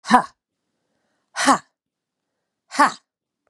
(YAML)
exhalation_length: 3.5 s
exhalation_amplitude: 32767
exhalation_signal_mean_std_ratio: 0.26
survey_phase: beta (2021-08-13 to 2022-03-07)
age: 45-64
gender: Female
wearing_mask: 'No'
symptom_cough_any: true
symptom_runny_or_blocked_nose: true
symptom_headache: true
symptom_onset: 1 day
smoker_status: Never smoked
respiratory_condition_asthma: false
respiratory_condition_other: false
recruitment_source: Test and Trace
submission_delay: 1 day
covid_test_result: Positive
covid_test_method: RT-qPCR
covid_ct_value: 18.4
covid_ct_gene: ORF1ab gene
covid_ct_mean: 18.7
covid_viral_load: 730000 copies/ml
covid_viral_load_category: Low viral load (10K-1M copies/ml)